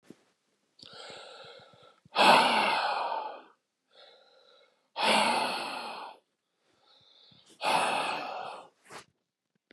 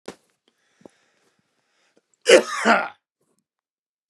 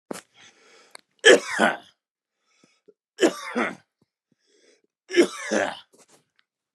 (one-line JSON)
{"exhalation_length": "9.7 s", "exhalation_amplitude": 13754, "exhalation_signal_mean_std_ratio": 0.43, "cough_length": "4.1 s", "cough_amplitude": 32767, "cough_signal_mean_std_ratio": 0.24, "three_cough_length": "6.7 s", "three_cough_amplitude": 31612, "three_cough_signal_mean_std_ratio": 0.28, "survey_phase": "beta (2021-08-13 to 2022-03-07)", "age": "18-44", "gender": "Male", "wearing_mask": "No", "symptom_cough_any": true, "symptom_shortness_of_breath": true, "symptom_sore_throat": true, "symptom_abdominal_pain": true, "symptom_fatigue": true, "symptom_fever_high_temperature": true, "symptom_headache": true, "symptom_other": true, "symptom_onset": "8 days", "smoker_status": "Never smoked", "respiratory_condition_asthma": false, "respiratory_condition_other": false, "recruitment_source": "REACT", "submission_delay": "4 days", "covid_test_result": "Negative", "covid_test_method": "RT-qPCR"}